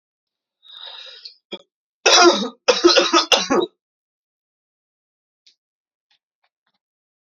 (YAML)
three_cough_length: 7.3 s
three_cough_amplitude: 32519
three_cough_signal_mean_std_ratio: 0.32
survey_phase: beta (2021-08-13 to 2022-03-07)
age: 18-44
gender: Male
wearing_mask: 'No'
symptom_cough_any: true
symptom_runny_or_blocked_nose: true
symptom_sore_throat: true
symptom_fatigue: true
symptom_headache: true
symptom_other: true
smoker_status: Never smoked
respiratory_condition_asthma: false
respiratory_condition_other: false
recruitment_source: Test and Trace
submission_delay: 1 day
covid_test_result: Positive
covid_test_method: ePCR